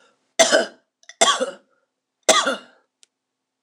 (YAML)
three_cough_length: 3.6 s
three_cough_amplitude: 26028
three_cough_signal_mean_std_ratio: 0.35
survey_phase: beta (2021-08-13 to 2022-03-07)
age: 45-64
gender: Female
wearing_mask: 'No'
symptom_cough_any: true
symptom_runny_or_blocked_nose: true
symptom_fatigue: true
symptom_onset: 8 days
smoker_status: Ex-smoker
respiratory_condition_asthma: false
respiratory_condition_other: false
recruitment_source: Test and Trace
submission_delay: 2 days
covid_test_result: Positive
covid_test_method: RT-qPCR